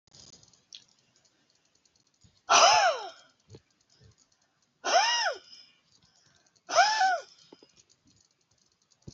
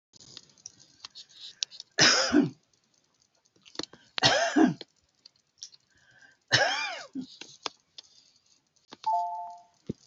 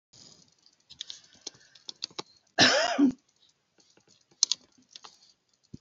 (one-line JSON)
{"exhalation_length": "9.1 s", "exhalation_amplitude": 15598, "exhalation_signal_mean_std_ratio": 0.33, "three_cough_length": "10.1 s", "three_cough_amplitude": 17733, "three_cough_signal_mean_std_ratio": 0.35, "cough_length": "5.8 s", "cough_amplitude": 21007, "cough_signal_mean_std_ratio": 0.27, "survey_phase": "beta (2021-08-13 to 2022-03-07)", "age": "65+", "gender": "Female", "wearing_mask": "No", "symptom_none": true, "smoker_status": "Ex-smoker", "respiratory_condition_asthma": false, "respiratory_condition_other": false, "recruitment_source": "REACT", "submission_delay": "1 day", "covid_test_result": "Negative", "covid_test_method": "RT-qPCR", "influenza_a_test_result": "Negative", "influenza_b_test_result": "Negative"}